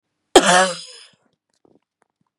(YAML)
cough_length: 2.4 s
cough_amplitude: 32768
cough_signal_mean_std_ratio: 0.3
survey_phase: beta (2021-08-13 to 2022-03-07)
age: 45-64
gender: Female
wearing_mask: 'No'
symptom_none: true
smoker_status: Never smoked
respiratory_condition_asthma: false
respiratory_condition_other: false
recruitment_source: REACT
submission_delay: 1 day
covid_test_result: Negative
covid_test_method: RT-qPCR
influenza_a_test_result: Negative
influenza_b_test_result: Negative